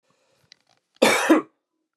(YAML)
cough_length: 2.0 s
cough_amplitude: 28303
cough_signal_mean_std_ratio: 0.34
survey_phase: beta (2021-08-13 to 2022-03-07)
age: 45-64
gender: Male
wearing_mask: 'No'
symptom_none: true
smoker_status: Never smoked
respiratory_condition_asthma: false
respiratory_condition_other: false
recruitment_source: REACT
submission_delay: 2 days
covid_test_result: Negative
covid_test_method: RT-qPCR
influenza_a_test_result: Negative
influenza_b_test_result: Negative